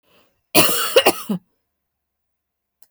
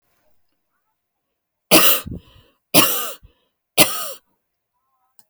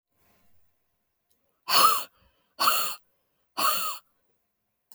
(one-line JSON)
{"cough_length": "2.9 s", "cough_amplitude": 32768, "cough_signal_mean_std_ratio": 0.34, "three_cough_length": "5.3 s", "three_cough_amplitude": 32768, "three_cough_signal_mean_std_ratio": 0.3, "exhalation_length": "4.9 s", "exhalation_amplitude": 16923, "exhalation_signal_mean_std_ratio": 0.36, "survey_phase": "alpha (2021-03-01 to 2021-08-12)", "age": "45-64", "gender": "Female", "wearing_mask": "No", "symptom_cough_any": true, "symptom_new_continuous_cough": true, "symptom_fatigue": true, "symptom_onset": "12 days", "smoker_status": "Never smoked", "respiratory_condition_asthma": false, "respiratory_condition_other": false, "recruitment_source": "REACT", "submission_delay": "1 day", "covid_test_result": "Negative", "covid_test_method": "RT-qPCR"}